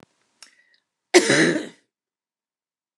{"cough_length": "3.0 s", "cough_amplitude": 29016, "cough_signal_mean_std_ratio": 0.3, "survey_phase": "alpha (2021-03-01 to 2021-08-12)", "age": "65+", "gender": "Female", "wearing_mask": "No", "symptom_shortness_of_breath": true, "symptom_onset": "12 days", "smoker_status": "Ex-smoker", "respiratory_condition_asthma": false, "respiratory_condition_other": true, "recruitment_source": "REACT", "submission_delay": "1 day", "covid_test_result": "Negative", "covid_test_method": "RT-qPCR"}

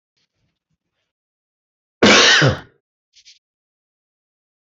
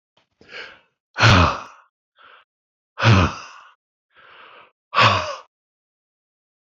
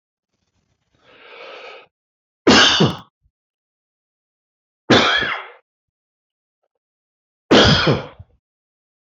{"cough_length": "4.8 s", "cough_amplitude": 26382, "cough_signal_mean_std_ratio": 0.28, "exhalation_length": "6.7 s", "exhalation_amplitude": 28260, "exhalation_signal_mean_std_ratio": 0.32, "three_cough_length": "9.1 s", "three_cough_amplitude": 27924, "three_cough_signal_mean_std_ratio": 0.32, "survey_phase": "beta (2021-08-13 to 2022-03-07)", "age": "65+", "gender": "Male", "wearing_mask": "No", "symptom_none": true, "smoker_status": "Ex-smoker", "respiratory_condition_asthma": false, "respiratory_condition_other": false, "recruitment_source": "REACT", "submission_delay": "4 days", "covid_test_result": "Negative", "covid_test_method": "RT-qPCR"}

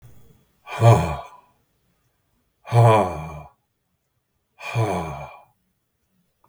{"exhalation_length": "6.5 s", "exhalation_amplitude": 31451, "exhalation_signal_mean_std_ratio": 0.34, "survey_phase": "beta (2021-08-13 to 2022-03-07)", "age": "65+", "gender": "Male", "wearing_mask": "No", "symptom_cough_any": true, "symptom_shortness_of_breath": true, "symptom_onset": "12 days", "smoker_status": "Ex-smoker", "respiratory_condition_asthma": false, "respiratory_condition_other": false, "recruitment_source": "REACT", "submission_delay": "1 day", "covid_test_result": "Negative", "covid_test_method": "RT-qPCR", "influenza_a_test_result": "Positive", "influenza_a_ct_value": 34.8, "influenza_b_test_result": "Positive", "influenza_b_ct_value": 35.9}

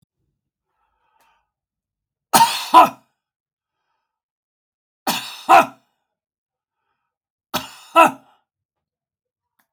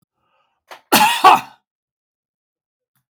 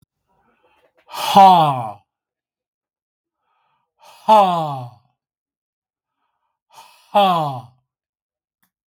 {"three_cough_length": "9.7 s", "three_cough_amplitude": 32768, "three_cough_signal_mean_std_ratio": 0.23, "cough_length": "3.2 s", "cough_amplitude": 32768, "cough_signal_mean_std_ratio": 0.28, "exhalation_length": "8.9 s", "exhalation_amplitude": 32768, "exhalation_signal_mean_std_ratio": 0.31, "survey_phase": "beta (2021-08-13 to 2022-03-07)", "age": "65+", "gender": "Male", "wearing_mask": "No", "symptom_none": true, "smoker_status": "Ex-smoker", "respiratory_condition_asthma": true, "respiratory_condition_other": false, "recruitment_source": "REACT", "submission_delay": "1 day", "covid_test_result": "Negative", "covid_test_method": "RT-qPCR"}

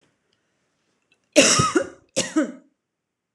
{"cough_length": "3.3 s", "cough_amplitude": 26028, "cough_signal_mean_std_ratio": 0.35, "survey_phase": "beta (2021-08-13 to 2022-03-07)", "age": "18-44", "gender": "Female", "wearing_mask": "No", "symptom_none": true, "smoker_status": "Ex-smoker", "respiratory_condition_asthma": false, "respiratory_condition_other": false, "recruitment_source": "REACT", "submission_delay": "1 day", "covid_test_result": "Negative", "covid_test_method": "RT-qPCR"}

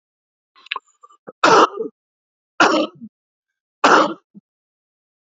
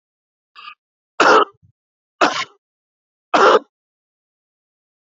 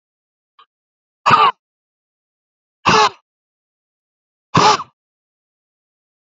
{"three_cough_length": "5.4 s", "three_cough_amplitude": 32569, "three_cough_signal_mean_std_ratio": 0.32, "cough_length": "5.0 s", "cough_amplitude": 28270, "cough_signal_mean_std_ratio": 0.3, "exhalation_length": "6.2 s", "exhalation_amplitude": 28982, "exhalation_signal_mean_std_ratio": 0.28, "survey_phase": "beta (2021-08-13 to 2022-03-07)", "age": "65+", "gender": "Male", "wearing_mask": "No", "symptom_cough_any": true, "symptom_runny_or_blocked_nose": true, "smoker_status": "Ex-smoker", "respiratory_condition_asthma": true, "respiratory_condition_other": false, "recruitment_source": "REACT", "submission_delay": "1 day", "covid_test_result": "Negative", "covid_test_method": "RT-qPCR"}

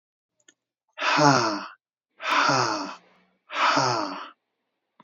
{"exhalation_length": "5.0 s", "exhalation_amplitude": 19997, "exhalation_signal_mean_std_ratio": 0.5, "survey_phase": "beta (2021-08-13 to 2022-03-07)", "age": "65+", "gender": "Male", "wearing_mask": "No", "symptom_none": true, "smoker_status": "Never smoked", "respiratory_condition_asthma": false, "respiratory_condition_other": false, "recruitment_source": "REACT", "submission_delay": "2 days", "covid_test_result": "Negative", "covid_test_method": "RT-qPCR", "influenza_a_test_result": "Negative", "influenza_b_test_result": "Negative"}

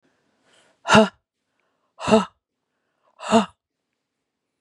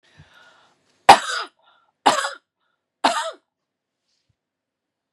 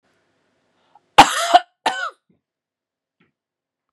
{"exhalation_length": "4.6 s", "exhalation_amplitude": 31056, "exhalation_signal_mean_std_ratio": 0.25, "three_cough_length": "5.1 s", "three_cough_amplitude": 32768, "three_cough_signal_mean_std_ratio": 0.22, "cough_length": "3.9 s", "cough_amplitude": 32768, "cough_signal_mean_std_ratio": 0.22, "survey_phase": "beta (2021-08-13 to 2022-03-07)", "age": "45-64", "gender": "Female", "wearing_mask": "No", "symptom_none": true, "smoker_status": "Never smoked", "respiratory_condition_asthma": false, "respiratory_condition_other": false, "recruitment_source": "REACT", "submission_delay": "2 days", "covid_test_result": "Negative", "covid_test_method": "RT-qPCR", "influenza_a_test_result": "Negative", "influenza_b_test_result": "Negative"}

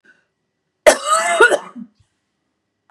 {"cough_length": "2.9 s", "cough_amplitude": 32768, "cough_signal_mean_std_ratio": 0.36, "survey_phase": "beta (2021-08-13 to 2022-03-07)", "age": "45-64", "gender": "Female", "wearing_mask": "No", "symptom_cough_any": true, "symptom_runny_or_blocked_nose": true, "symptom_fatigue": true, "symptom_onset": "2 days", "smoker_status": "Never smoked", "respiratory_condition_asthma": false, "respiratory_condition_other": false, "recruitment_source": "Test and Trace", "submission_delay": "1 day", "covid_test_result": "Negative", "covid_test_method": "ePCR"}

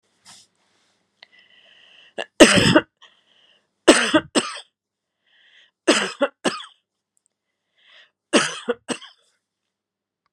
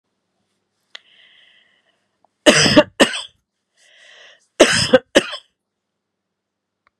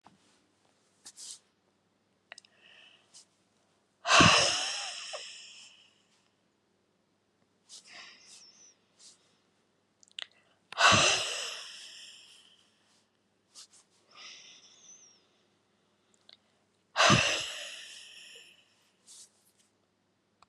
{"three_cough_length": "10.3 s", "three_cough_amplitude": 32768, "three_cough_signal_mean_std_ratio": 0.27, "cough_length": "7.0 s", "cough_amplitude": 32768, "cough_signal_mean_std_ratio": 0.27, "exhalation_length": "20.5 s", "exhalation_amplitude": 13146, "exhalation_signal_mean_std_ratio": 0.27, "survey_phase": "beta (2021-08-13 to 2022-03-07)", "age": "45-64", "gender": "Female", "wearing_mask": "No", "symptom_none": true, "smoker_status": "Never smoked", "respiratory_condition_asthma": false, "respiratory_condition_other": false, "recruitment_source": "REACT", "submission_delay": "2 days", "covid_test_result": "Negative", "covid_test_method": "RT-qPCR"}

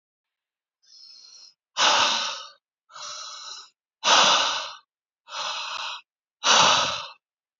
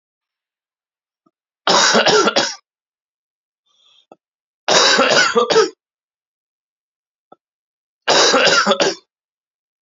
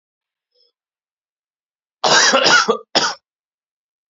{"exhalation_length": "7.6 s", "exhalation_amplitude": 20868, "exhalation_signal_mean_std_ratio": 0.45, "three_cough_length": "9.8 s", "three_cough_amplitude": 32768, "three_cough_signal_mean_std_ratio": 0.43, "cough_length": "4.1 s", "cough_amplitude": 32694, "cough_signal_mean_std_ratio": 0.37, "survey_phase": "beta (2021-08-13 to 2022-03-07)", "age": "18-44", "gender": "Male", "wearing_mask": "No", "symptom_cough_any": true, "symptom_new_continuous_cough": true, "symptom_fatigue": true, "symptom_onset": "3 days", "smoker_status": "Never smoked", "respiratory_condition_asthma": true, "respiratory_condition_other": false, "recruitment_source": "Test and Trace", "submission_delay": "2 days", "covid_test_result": "Positive", "covid_test_method": "ePCR"}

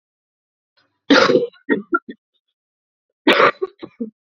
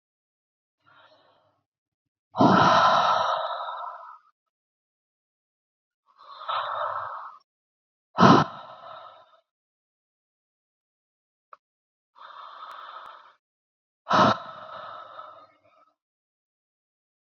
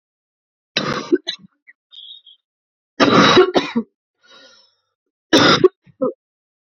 {"cough_length": "4.4 s", "cough_amplitude": 32767, "cough_signal_mean_std_ratio": 0.35, "exhalation_length": "17.3 s", "exhalation_amplitude": 24634, "exhalation_signal_mean_std_ratio": 0.3, "three_cough_length": "6.7 s", "three_cough_amplitude": 32768, "three_cough_signal_mean_std_ratio": 0.36, "survey_phase": "beta (2021-08-13 to 2022-03-07)", "age": "18-44", "gender": "Female", "wearing_mask": "Yes", "symptom_cough_any": true, "symptom_runny_or_blocked_nose": true, "symptom_shortness_of_breath": true, "symptom_sore_throat": true, "symptom_diarrhoea": true, "symptom_headache": true, "smoker_status": "Current smoker (1 to 10 cigarettes per day)", "respiratory_condition_asthma": false, "respiratory_condition_other": false, "recruitment_source": "Test and Trace", "submission_delay": "1 day", "covid_test_result": "Positive", "covid_test_method": "RT-qPCR", "covid_ct_value": 15.6, "covid_ct_gene": "ORF1ab gene", "covid_ct_mean": 15.8, "covid_viral_load": "6700000 copies/ml", "covid_viral_load_category": "High viral load (>1M copies/ml)"}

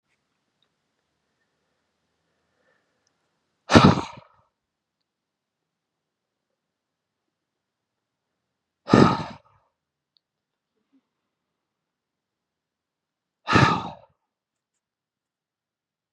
{"exhalation_length": "16.1 s", "exhalation_amplitude": 32768, "exhalation_signal_mean_std_ratio": 0.17, "survey_phase": "beta (2021-08-13 to 2022-03-07)", "age": "18-44", "gender": "Male", "wearing_mask": "No", "symptom_none": true, "smoker_status": "Never smoked", "respiratory_condition_asthma": false, "respiratory_condition_other": false, "recruitment_source": "REACT", "submission_delay": "1 day", "covid_test_result": "Negative", "covid_test_method": "RT-qPCR", "influenza_a_test_result": "Negative", "influenza_b_test_result": "Negative"}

